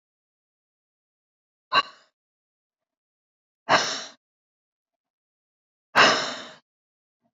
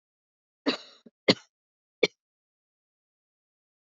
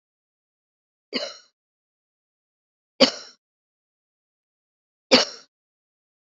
{"exhalation_length": "7.3 s", "exhalation_amplitude": 22921, "exhalation_signal_mean_std_ratio": 0.23, "cough_length": "3.9 s", "cough_amplitude": 17793, "cough_signal_mean_std_ratio": 0.15, "three_cough_length": "6.4 s", "three_cough_amplitude": 28838, "three_cough_signal_mean_std_ratio": 0.17, "survey_phase": "beta (2021-08-13 to 2022-03-07)", "age": "45-64", "gender": "Female", "wearing_mask": "Yes", "symptom_cough_any": true, "symptom_sore_throat": true, "symptom_fatigue": true, "symptom_fever_high_temperature": true, "symptom_headache": true, "smoker_status": "Never smoked", "respiratory_condition_asthma": false, "respiratory_condition_other": false, "recruitment_source": "Test and Trace", "submission_delay": "2 days", "covid_test_result": "Positive", "covid_test_method": "RT-qPCR", "covid_ct_value": 21.7, "covid_ct_gene": "ORF1ab gene", "covid_ct_mean": 22.3, "covid_viral_load": "47000 copies/ml", "covid_viral_load_category": "Low viral load (10K-1M copies/ml)"}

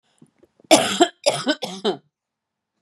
{"cough_length": "2.8 s", "cough_amplitude": 32767, "cough_signal_mean_std_ratio": 0.36, "survey_phase": "beta (2021-08-13 to 2022-03-07)", "age": "45-64", "gender": "Female", "wearing_mask": "No", "symptom_cough_any": true, "symptom_runny_or_blocked_nose": true, "symptom_sore_throat": true, "symptom_fatigue": true, "symptom_headache": true, "symptom_onset": "7 days", "smoker_status": "Never smoked", "respiratory_condition_asthma": false, "respiratory_condition_other": false, "recruitment_source": "Test and Trace", "submission_delay": "1 day", "covid_test_result": "Negative", "covid_test_method": "RT-qPCR"}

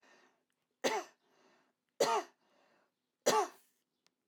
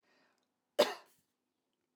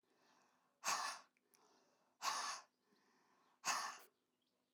{"three_cough_length": "4.3 s", "three_cough_amplitude": 5011, "three_cough_signal_mean_std_ratio": 0.3, "cough_length": "2.0 s", "cough_amplitude": 6456, "cough_signal_mean_std_ratio": 0.18, "exhalation_length": "4.7 s", "exhalation_amplitude": 1675, "exhalation_signal_mean_std_ratio": 0.38, "survey_phase": "alpha (2021-03-01 to 2021-08-12)", "age": "45-64", "gender": "Female", "wearing_mask": "No", "symptom_none": true, "smoker_status": "Ex-smoker", "respiratory_condition_asthma": false, "respiratory_condition_other": false, "recruitment_source": "REACT", "submission_delay": "2 days", "covid_test_result": "Negative", "covid_test_method": "RT-qPCR"}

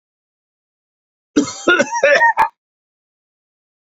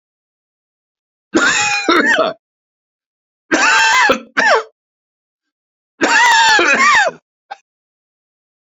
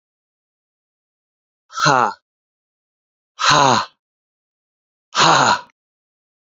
{"cough_length": "3.8 s", "cough_amplitude": 28157, "cough_signal_mean_std_ratio": 0.37, "three_cough_length": "8.8 s", "three_cough_amplitude": 30602, "three_cough_signal_mean_std_ratio": 0.51, "exhalation_length": "6.5 s", "exhalation_amplitude": 31762, "exhalation_signal_mean_std_ratio": 0.34, "survey_phase": "beta (2021-08-13 to 2022-03-07)", "age": "45-64", "gender": "Male", "wearing_mask": "No", "symptom_cough_any": true, "symptom_new_continuous_cough": true, "symptom_runny_or_blocked_nose": true, "symptom_shortness_of_breath": true, "symptom_sore_throat": true, "symptom_fatigue": true, "symptom_headache": true, "symptom_onset": "3 days", "smoker_status": "Never smoked", "respiratory_condition_asthma": false, "respiratory_condition_other": false, "recruitment_source": "Test and Trace", "submission_delay": "1 day", "covid_test_result": "Negative", "covid_test_method": "RT-qPCR"}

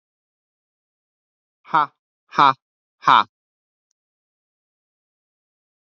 {"exhalation_length": "5.9 s", "exhalation_amplitude": 32387, "exhalation_signal_mean_std_ratio": 0.19, "survey_phase": "beta (2021-08-13 to 2022-03-07)", "age": "18-44", "gender": "Male", "wearing_mask": "No", "symptom_cough_any": true, "symptom_runny_or_blocked_nose": true, "symptom_sore_throat": true, "symptom_fatigue": true, "smoker_status": "Never smoked", "respiratory_condition_asthma": false, "respiratory_condition_other": false, "recruitment_source": "Test and Trace", "submission_delay": "1 day", "covid_test_result": "Negative", "covid_test_method": "LFT"}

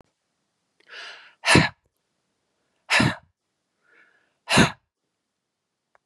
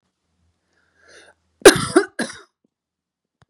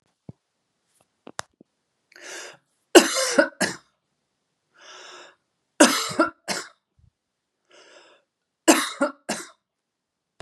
{"exhalation_length": "6.1 s", "exhalation_amplitude": 27647, "exhalation_signal_mean_std_ratio": 0.26, "cough_length": "3.5 s", "cough_amplitude": 32768, "cough_signal_mean_std_ratio": 0.2, "three_cough_length": "10.4 s", "three_cough_amplitude": 32767, "three_cough_signal_mean_std_ratio": 0.25, "survey_phase": "beta (2021-08-13 to 2022-03-07)", "age": "65+", "gender": "Female", "wearing_mask": "No", "symptom_none": true, "smoker_status": "Ex-smoker", "respiratory_condition_asthma": false, "respiratory_condition_other": false, "recruitment_source": "REACT", "submission_delay": "0 days", "covid_test_result": "Negative", "covid_test_method": "RT-qPCR", "influenza_a_test_result": "Negative", "influenza_b_test_result": "Negative"}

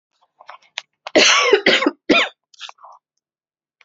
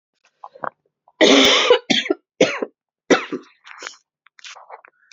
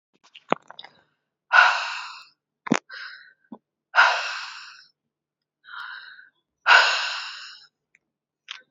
{"cough_length": "3.8 s", "cough_amplitude": 29191, "cough_signal_mean_std_ratio": 0.4, "three_cough_length": "5.1 s", "three_cough_amplitude": 32627, "three_cough_signal_mean_std_ratio": 0.38, "exhalation_length": "8.7 s", "exhalation_amplitude": 27752, "exhalation_signal_mean_std_ratio": 0.32, "survey_phase": "beta (2021-08-13 to 2022-03-07)", "age": "18-44", "gender": "Female", "wearing_mask": "No", "symptom_cough_any": true, "symptom_runny_or_blocked_nose": true, "symptom_sore_throat": true, "symptom_fever_high_temperature": true, "symptom_other": true, "smoker_status": "Never smoked", "respiratory_condition_asthma": false, "respiratory_condition_other": false, "recruitment_source": "Test and Trace", "submission_delay": "1 day", "covid_test_result": "Positive", "covid_test_method": "RT-qPCR", "covid_ct_value": 27.0, "covid_ct_gene": "ORF1ab gene", "covid_ct_mean": 27.5, "covid_viral_load": "930 copies/ml", "covid_viral_load_category": "Minimal viral load (< 10K copies/ml)"}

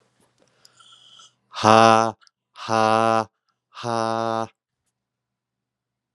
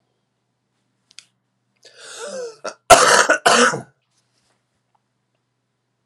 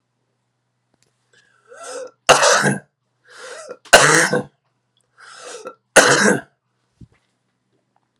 {"exhalation_length": "6.1 s", "exhalation_amplitude": 32046, "exhalation_signal_mean_std_ratio": 0.3, "cough_length": "6.1 s", "cough_amplitude": 32768, "cough_signal_mean_std_ratio": 0.29, "three_cough_length": "8.2 s", "three_cough_amplitude": 32768, "three_cough_signal_mean_std_ratio": 0.33, "survey_phase": "alpha (2021-03-01 to 2021-08-12)", "age": "45-64", "gender": "Male", "wearing_mask": "No", "symptom_none": true, "symptom_onset": "3 days", "smoker_status": "Current smoker (11 or more cigarettes per day)", "respiratory_condition_asthma": false, "respiratory_condition_other": false, "recruitment_source": "Test and Trace", "submission_delay": "2 days", "covid_test_result": "Positive", "covid_test_method": "RT-qPCR", "covid_ct_value": 18.4, "covid_ct_gene": "ORF1ab gene", "covid_ct_mean": 18.6, "covid_viral_load": "810000 copies/ml", "covid_viral_load_category": "Low viral load (10K-1M copies/ml)"}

